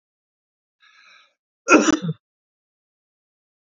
{"cough_length": "3.8 s", "cough_amplitude": 30210, "cough_signal_mean_std_ratio": 0.23, "survey_phase": "beta (2021-08-13 to 2022-03-07)", "age": "45-64", "gender": "Male", "wearing_mask": "No", "symptom_none": true, "smoker_status": "Never smoked", "respiratory_condition_asthma": false, "respiratory_condition_other": false, "recruitment_source": "REACT", "submission_delay": "2 days", "covid_test_result": "Negative", "covid_test_method": "RT-qPCR", "influenza_a_test_result": "Negative", "influenza_b_test_result": "Negative"}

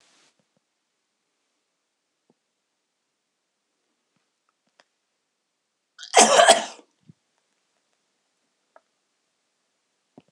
{"cough_length": "10.3 s", "cough_amplitude": 26028, "cough_signal_mean_std_ratio": 0.16, "survey_phase": "beta (2021-08-13 to 2022-03-07)", "age": "45-64", "gender": "Male", "wearing_mask": "No", "symptom_none": true, "smoker_status": "Never smoked", "respiratory_condition_asthma": false, "respiratory_condition_other": true, "recruitment_source": "REACT", "submission_delay": "2 days", "covid_test_result": "Negative", "covid_test_method": "RT-qPCR", "influenza_a_test_result": "Negative", "influenza_b_test_result": "Negative"}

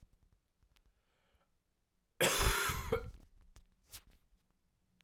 {"cough_length": "5.0 s", "cough_amplitude": 3976, "cough_signal_mean_std_ratio": 0.34, "survey_phase": "alpha (2021-03-01 to 2021-08-12)", "age": "18-44", "gender": "Male", "wearing_mask": "No", "symptom_cough_any": true, "symptom_new_continuous_cough": true, "symptom_diarrhoea": true, "symptom_fatigue": true, "symptom_headache": true, "symptom_change_to_sense_of_smell_or_taste": true, "symptom_loss_of_taste": true, "symptom_onset": "3 days", "smoker_status": "Never smoked", "respiratory_condition_asthma": false, "respiratory_condition_other": false, "recruitment_source": "Test and Trace", "submission_delay": "2 days", "covid_test_result": "Positive", "covid_test_method": "RT-qPCR", "covid_ct_value": 20.5, "covid_ct_gene": "N gene"}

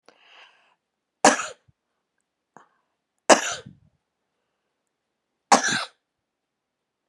{"three_cough_length": "7.1 s", "three_cough_amplitude": 32767, "three_cough_signal_mean_std_ratio": 0.2, "survey_phase": "beta (2021-08-13 to 2022-03-07)", "age": "45-64", "gender": "Female", "wearing_mask": "No", "symptom_none": true, "smoker_status": "Never smoked", "respiratory_condition_asthma": false, "respiratory_condition_other": false, "recruitment_source": "REACT", "submission_delay": "2 days", "covid_test_result": "Negative", "covid_test_method": "RT-qPCR"}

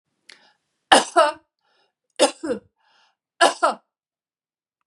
{"three_cough_length": "4.9 s", "three_cough_amplitude": 32767, "three_cough_signal_mean_std_ratio": 0.28, "survey_phase": "beta (2021-08-13 to 2022-03-07)", "age": "65+", "gender": "Female", "wearing_mask": "No", "symptom_none": true, "smoker_status": "Ex-smoker", "respiratory_condition_asthma": false, "respiratory_condition_other": false, "recruitment_source": "REACT", "submission_delay": "1 day", "covid_test_result": "Negative", "covid_test_method": "RT-qPCR"}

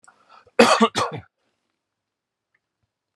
{"cough_length": "3.2 s", "cough_amplitude": 31958, "cough_signal_mean_std_ratio": 0.27, "survey_phase": "beta (2021-08-13 to 2022-03-07)", "age": "45-64", "gender": "Male", "wearing_mask": "No", "symptom_runny_or_blocked_nose": true, "symptom_abdominal_pain": true, "symptom_fatigue": true, "symptom_other": true, "symptom_onset": "10 days", "smoker_status": "Never smoked", "respiratory_condition_asthma": false, "respiratory_condition_other": false, "recruitment_source": "REACT", "submission_delay": "1 day", "covid_test_result": "Negative", "covid_test_method": "RT-qPCR", "covid_ct_value": 43.0, "covid_ct_gene": "N gene"}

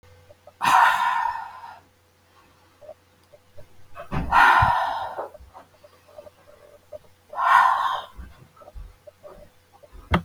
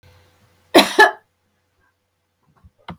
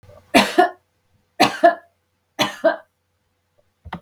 {"exhalation_length": "10.2 s", "exhalation_amplitude": 24227, "exhalation_signal_mean_std_ratio": 0.43, "cough_length": "3.0 s", "cough_amplitude": 32768, "cough_signal_mean_std_ratio": 0.24, "three_cough_length": "4.0 s", "three_cough_amplitude": 32768, "three_cough_signal_mean_std_ratio": 0.33, "survey_phase": "beta (2021-08-13 to 2022-03-07)", "age": "65+", "gender": "Female", "wearing_mask": "No", "symptom_none": true, "smoker_status": "Never smoked", "respiratory_condition_asthma": false, "respiratory_condition_other": false, "recruitment_source": "REACT", "submission_delay": "3 days", "covid_test_result": "Negative", "covid_test_method": "RT-qPCR", "influenza_a_test_result": "Negative", "influenza_b_test_result": "Negative"}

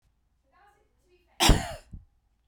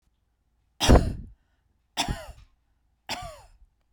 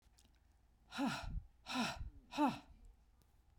{"cough_length": "2.5 s", "cough_amplitude": 20110, "cough_signal_mean_std_ratio": 0.24, "three_cough_length": "3.9 s", "three_cough_amplitude": 25315, "three_cough_signal_mean_std_ratio": 0.27, "exhalation_length": "3.6 s", "exhalation_amplitude": 2044, "exhalation_signal_mean_std_ratio": 0.47, "survey_phase": "beta (2021-08-13 to 2022-03-07)", "age": "45-64", "gender": "Female", "wearing_mask": "No", "symptom_none": true, "smoker_status": "Never smoked", "respiratory_condition_asthma": false, "respiratory_condition_other": false, "recruitment_source": "REACT", "submission_delay": "2 days", "covid_test_result": "Negative", "covid_test_method": "RT-qPCR", "influenza_a_test_result": "Negative", "influenza_b_test_result": "Negative"}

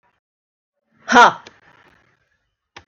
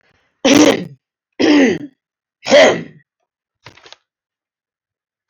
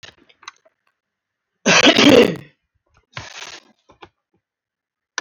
{"exhalation_length": "2.9 s", "exhalation_amplitude": 32673, "exhalation_signal_mean_std_ratio": 0.22, "three_cough_length": "5.3 s", "three_cough_amplitude": 32767, "three_cough_signal_mean_std_ratio": 0.37, "cough_length": "5.2 s", "cough_amplitude": 32768, "cough_signal_mean_std_ratio": 0.29, "survey_phase": "alpha (2021-03-01 to 2021-08-12)", "age": "45-64", "gender": "Female", "wearing_mask": "No", "symptom_none": true, "smoker_status": "Never smoked", "respiratory_condition_asthma": false, "respiratory_condition_other": false, "recruitment_source": "REACT", "submission_delay": "3 days", "covid_test_result": "Negative", "covid_test_method": "RT-qPCR"}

